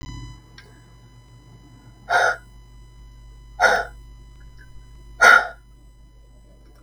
{"exhalation_length": "6.8 s", "exhalation_amplitude": 32768, "exhalation_signal_mean_std_ratio": 0.32, "survey_phase": "beta (2021-08-13 to 2022-03-07)", "age": "65+", "gender": "Female", "wearing_mask": "No", "symptom_none": true, "smoker_status": "Never smoked", "respiratory_condition_asthma": false, "respiratory_condition_other": false, "recruitment_source": "REACT", "submission_delay": "2 days", "covid_test_result": "Negative", "covid_test_method": "RT-qPCR"}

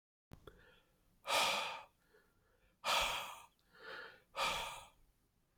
{"exhalation_length": "5.6 s", "exhalation_amplitude": 2544, "exhalation_signal_mean_std_ratio": 0.44, "survey_phase": "alpha (2021-03-01 to 2021-08-12)", "age": "18-44", "gender": "Male", "wearing_mask": "No", "symptom_none": true, "smoker_status": "Never smoked", "respiratory_condition_asthma": false, "respiratory_condition_other": false, "recruitment_source": "REACT", "submission_delay": "1 day", "covid_test_result": "Negative", "covid_test_method": "RT-qPCR"}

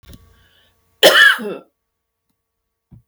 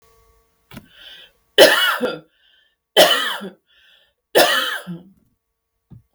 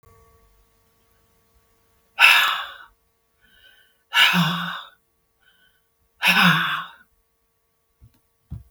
{"cough_length": "3.1 s", "cough_amplitude": 32768, "cough_signal_mean_std_ratio": 0.3, "three_cough_length": "6.1 s", "three_cough_amplitude": 32768, "three_cough_signal_mean_std_ratio": 0.36, "exhalation_length": "8.7 s", "exhalation_amplitude": 32766, "exhalation_signal_mean_std_ratio": 0.34, "survey_phase": "beta (2021-08-13 to 2022-03-07)", "age": "45-64", "gender": "Female", "wearing_mask": "No", "symptom_none": true, "symptom_onset": "12 days", "smoker_status": "Ex-smoker", "respiratory_condition_asthma": false, "respiratory_condition_other": false, "recruitment_source": "REACT", "submission_delay": "1 day", "covid_test_result": "Negative", "covid_test_method": "RT-qPCR"}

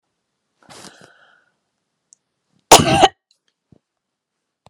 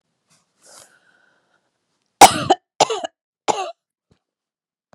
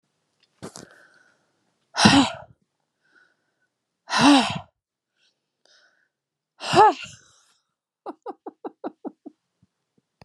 {"cough_length": "4.7 s", "cough_amplitude": 32768, "cough_signal_mean_std_ratio": 0.2, "three_cough_length": "4.9 s", "three_cough_amplitude": 32768, "three_cough_signal_mean_std_ratio": 0.2, "exhalation_length": "10.2 s", "exhalation_amplitude": 30926, "exhalation_signal_mean_std_ratio": 0.26, "survey_phase": "beta (2021-08-13 to 2022-03-07)", "age": "45-64", "gender": "Female", "wearing_mask": "No", "symptom_none": true, "smoker_status": "Ex-smoker", "respiratory_condition_asthma": false, "respiratory_condition_other": false, "recruitment_source": "REACT", "submission_delay": "1 day", "covid_test_result": "Negative", "covid_test_method": "RT-qPCR"}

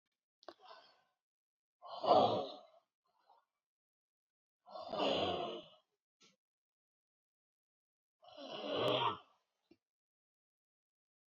{"exhalation_length": "11.3 s", "exhalation_amplitude": 4836, "exhalation_signal_mean_std_ratio": 0.31, "survey_phase": "alpha (2021-03-01 to 2021-08-12)", "age": "45-64", "gender": "Female", "wearing_mask": "No", "symptom_cough_any": true, "symptom_shortness_of_breath": true, "symptom_fatigue": true, "smoker_status": "Current smoker (11 or more cigarettes per day)", "respiratory_condition_asthma": true, "respiratory_condition_other": true, "recruitment_source": "REACT", "submission_delay": "2 days", "covid_test_result": "Negative", "covid_test_method": "RT-qPCR"}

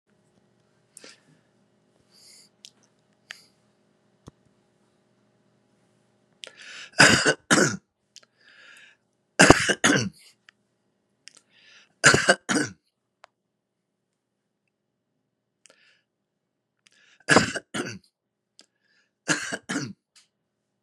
{"three_cough_length": "20.8 s", "three_cough_amplitude": 32768, "three_cough_signal_mean_std_ratio": 0.23, "survey_phase": "beta (2021-08-13 to 2022-03-07)", "age": "65+", "gender": "Male", "wearing_mask": "No", "symptom_none": true, "smoker_status": "Never smoked", "respiratory_condition_asthma": false, "respiratory_condition_other": false, "recruitment_source": "REACT", "submission_delay": "5 days", "covid_test_result": "Negative", "covid_test_method": "RT-qPCR", "influenza_a_test_result": "Negative", "influenza_b_test_result": "Negative"}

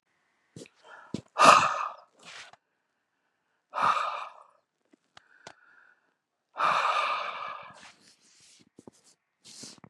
{"exhalation_length": "9.9 s", "exhalation_amplitude": 25120, "exhalation_signal_mean_std_ratio": 0.31, "survey_phase": "beta (2021-08-13 to 2022-03-07)", "age": "45-64", "gender": "Male", "wearing_mask": "No", "symptom_none": true, "smoker_status": "Current smoker (e-cigarettes or vapes only)", "respiratory_condition_asthma": false, "respiratory_condition_other": false, "recruitment_source": "REACT", "submission_delay": "2 days", "covid_test_result": "Negative", "covid_test_method": "RT-qPCR", "influenza_a_test_result": "Unknown/Void", "influenza_b_test_result": "Unknown/Void"}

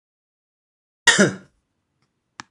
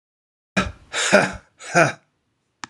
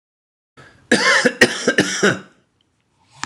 {"cough_length": "2.5 s", "cough_amplitude": 26018, "cough_signal_mean_std_ratio": 0.24, "exhalation_length": "2.7 s", "exhalation_amplitude": 26028, "exhalation_signal_mean_std_ratio": 0.37, "three_cough_length": "3.3 s", "three_cough_amplitude": 26028, "three_cough_signal_mean_std_ratio": 0.43, "survey_phase": "alpha (2021-03-01 to 2021-08-12)", "age": "45-64", "gender": "Male", "wearing_mask": "No", "symptom_cough_any": true, "symptom_abdominal_pain": true, "symptom_fatigue": true, "symptom_headache": true, "smoker_status": "Ex-smoker", "respiratory_condition_asthma": false, "respiratory_condition_other": false, "recruitment_source": "Test and Trace", "submission_delay": "2 days", "covid_test_result": "Positive", "covid_test_method": "RT-qPCR", "covid_ct_value": 26.0, "covid_ct_gene": "ORF1ab gene"}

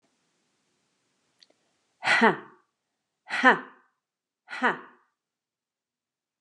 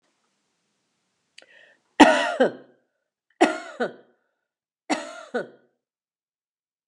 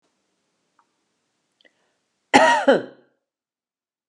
{"exhalation_length": "6.4 s", "exhalation_amplitude": 25308, "exhalation_signal_mean_std_ratio": 0.24, "three_cough_length": "6.9 s", "three_cough_amplitude": 32768, "three_cough_signal_mean_std_ratio": 0.25, "cough_length": "4.1 s", "cough_amplitude": 32767, "cough_signal_mean_std_ratio": 0.25, "survey_phase": "alpha (2021-03-01 to 2021-08-12)", "age": "45-64", "gender": "Female", "wearing_mask": "No", "symptom_none": true, "smoker_status": "Ex-smoker", "respiratory_condition_asthma": false, "respiratory_condition_other": false, "recruitment_source": "REACT", "submission_delay": "1 day", "covid_test_result": "Negative", "covid_test_method": "RT-qPCR"}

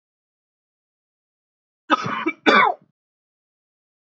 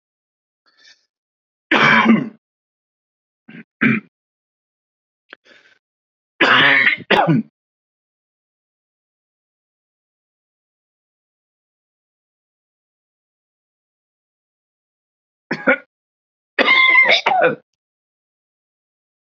{"cough_length": "4.1 s", "cough_amplitude": 27093, "cough_signal_mean_std_ratio": 0.28, "three_cough_length": "19.3 s", "three_cough_amplitude": 28780, "three_cough_signal_mean_std_ratio": 0.3, "survey_phase": "beta (2021-08-13 to 2022-03-07)", "age": "45-64", "gender": "Male", "wearing_mask": "No", "symptom_cough_any": true, "symptom_onset": "12 days", "smoker_status": "Ex-smoker", "respiratory_condition_asthma": false, "respiratory_condition_other": false, "recruitment_source": "REACT", "submission_delay": "6 days", "covid_test_result": "Negative", "covid_test_method": "RT-qPCR", "influenza_a_test_result": "Negative", "influenza_b_test_result": "Negative"}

